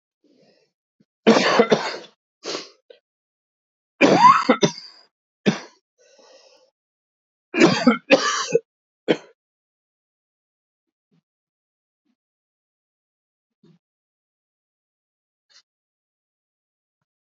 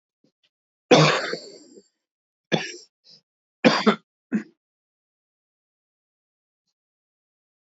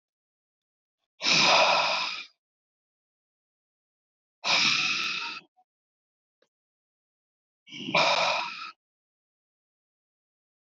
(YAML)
three_cough_length: 17.2 s
three_cough_amplitude: 27106
three_cough_signal_mean_std_ratio: 0.26
cough_length: 7.8 s
cough_amplitude: 25202
cough_signal_mean_std_ratio: 0.25
exhalation_length: 10.8 s
exhalation_amplitude: 13327
exhalation_signal_mean_std_ratio: 0.38
survey_phase: beta (2021-08-13 to 2022-03-07)
age: 65+
gender: Male
wearing_mask: 'No'
symptom_cough_any: true
symptom_runny_or_blocked_nose: true
symptom_shortness_of_breath: true
symptom_fatigue: true
smoker_status: Never smoked
respiratory_condition_asthma: true
respiratory_condition_other: false
recruitment_source: Test and Trace
submission_delay: 2 days
covid_test_result: Positive
covid_test_method: RT-qPCR